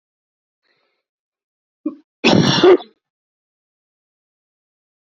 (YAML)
cough_length: 5.0 s
cough_amplitude: 32768
cough_signal_mean_std_ratio: 0.26
survey_phase: beta (2021-08-13 to 2022-03-07)
age: 18-44
gender: Male
wearing_mask: 'No'
symptom_none: true
smoker_status: Ex-smoker
respiratory_condition_asthma: false
respiratory_condition_other: false
recruitment_source: REACT
submission_delay: 2 days
covid_test_result: Negative
covid_test_method: RT-qPCR